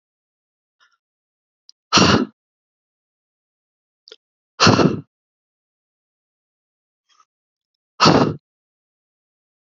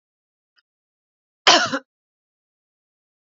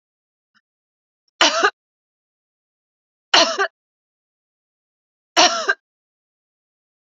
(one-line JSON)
{"exhalation_length": "9.7 s", "exhalation_amplitude": 30963, "exhalation_signal_mean_std_ratio": 0.25, "cough_length": "3.2 s", "cough_amplitude": 30650, "cough_signal_mean_std_ratio": 0.21, "three_cough_length": "7.2 s", "three_cough_amplitude": 32768, "three_cough_signal_mean_std_ratio": 0.26, "survey_phase": "beta (2021-08-13 to 2022-03-07)", "age": "45-64", "gender": "Female", "wearing_mask": "No", "symptom_runny_or_blocked_nose": true, "symptom_fatigue": true, "symptom_headache": true, "symptom_onset": "6 days", "smoker_status": "Ex-smoker", "respiratory_condition_asthma": false, "respiratory_condition_other": false, "recruitment_source": "REACT", "submission_delay": "1 day", "covid_test_result": "Negative", "covid_test_method": "RT-qPCR", "influenza_a_test_result": "Negative", "influenza_b_test_result": "Negative"}